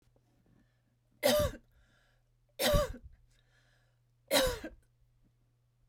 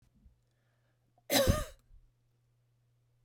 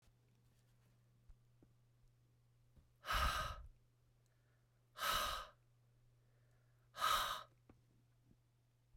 {"three_cough_length": "5.9 s", "three_cough_amplitude": 6539, "three_cough_signal_mean_std_ratio": 0.33, "cough_length": "3.2 s", "cough_amplitude": 6098, "cough_signal_mean_std_ratio": 0.27, "exhalation_length": "9.0 s", "exhalation_amplitude": 1777, "exhalation_signal_mean_std_ratio": 0.35, "survey_phase": "beta (2021-08-13 to 2022-03-07)", "age": "45-64", "gender": "Female", "wearing_mask": "No", "symptom_none": true, "smoker_status": "Ex-smoker", "respiratory_condition_asthma": false, "respiratory_condition_other": false, "recruitment_source": "REACT", "submission_delay": "1 day", "covid_test_result": "Negative", "covid_test_method": "RT-qPCR"}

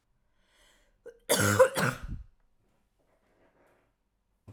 {"cough_length": "4.5 s", "cough_amplitude": 11300, "cough_signal_mean_std_ratio": 0.29, "survey_phase": "alpha (2021-03-01 to 2021-08-12)", "age": "18-44", "gender": "Female", "wearing_mask": "No", "symptom_shortness_of_breath": true, "symptom_headache": true, "symptom_change_to_sense_of_smell_or_taste": true, "symptom_loss_of_taste": true, "symptom_onset": "3 days", "smoker_status": "Ex-smoker", "respiratory_condition_asthma": false, "respiratory_condition_other": false, "recruitment_source": "Test and Trace", "submission_delay": "2 days", "covid_test_result": "Positive", "covid_test_method": "RT-qPCR", "covid_ct_value": 12.4, "covid_ct_gene": "N gene", "covid_ct_mean": 12.7, "covid_viral_load": "70000000 copies/ml", "covid_viral_load_category": "High viral load (>1M copies/ml)"}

